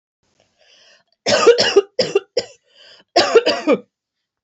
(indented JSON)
{
  "cough_length": "4.4 s",
  "cough_amplitude": 28024,
  "cough_signal_mean_std_ratio": 0.41,
  "survey_phase": "beta (2021-08-13 to 2022-03-07)",
  "age": "18-44",
  "gender": "Female",
  "wearing_mask": "No",
  "symptom_runny_or_blocked_nose": true,
  "symptom_headache": true,
  "symptom_change_to_sense_of_smell_or_taste": true,
  "symptom_loss_of_taste": true,
  "symptom_onset": "3 days",
  "smoker_status": "Never smoked",
  "respiratory_condition_asthma": false,
  "respiratory_condition_other": false,
  "recruitment_source": "Test and Trace",
  "submission_delay": "1 day",
  "covid_test_result": "Positive",
  "covid_test_method": "RT-qPCR",
  "covid_ct_value": 26.8,
  "covid_ct_gene": "ORF1ab gene"
}